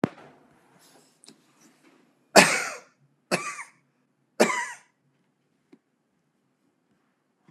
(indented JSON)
{
  "three_cough_length": "7.5 s",
  "three_cough_amplitude": 32768,
  "three_cough_signal_mean_std_ratio": 0.21,
  "survey_phase": "beta (2021-08-13 to 2022-03-07)",
  "age": "65+",
  "gender": "Male",
  "wearing_mask": "No",
  "symptom_none": true,
  "smoker_status": "Ex-smoker",
  "respiratory_condition_asthma": false,
  "respiratory_condition_other": false,
  "recruitment_source": "REACT",
  "submission_delay": "1 day",
  "covid_test_result": "Negative",
  "covid_test_method": "RT-qPCR"
}